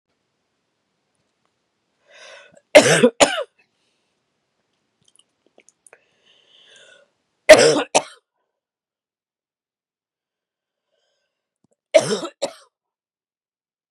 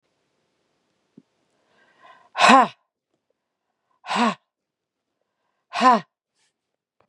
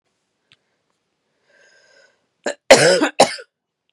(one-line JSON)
{"three_cough_length": "13.9 s", "three_cough_amplitude": 32768, "three_cough_signal_mean_std_ratio": 0.2, "exhalation_length": "7.1 s", "exhalation_amplitude": 32767, "exhalation_signal_mean_std_ratio": 0.24, "cough_length": "3.9 s", "cough_amplitude": 32768, "cough_signal_mean_std_ratio": 0.27, "survey_phase": "beta (2021-08-13 to 2022-03-07)", "age": "45-64", "gender": "Female", "wearing_mask": "No", "symptom_none": true, "symptom_onset": "7 days", "smoker_status": "Ex-smoker", "respiratory_condition_asthma": false, "respiratory_condition_other": false, "recruitment_source": "REACT", "submission_delay": "2 days", "covid_test_result": "Negative", "covid_test_method": "RT-qPCR", "influenza_a_test_result": "Negative", "influenza_b_test_result": "Negative"}